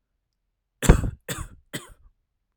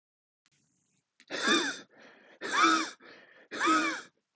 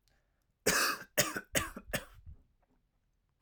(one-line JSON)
{"three_cough_length": "2.6 s", "three_cough_amplitude": 32768, "three_cough_signal_mean_std_ratio": 0.23, "exhalation_length": "4.4 s", "exhalation_amplitude": 8914, "exhalation_signal_mean_std_ratio": 0.45, "cough_length": "3.4 s", "cough_amplitude": 7247, "cough_signal_mean_std_ratio": 0.38, "survey_phase": "alpha (2021-03-01 to 2021-08-12)", "age": "18-44", "gender": "Male", "wearing_mask": "No", "symptom_none": true, "smoker_status": "Never smoked", "respiratory_condition_asthma": true, "respiratory_condition_other": false, "recruitment_source": "REACT", "submission_delay": "6 days", "covid_test_result": "Negative", "covid_test_method": "RT-qPCR"}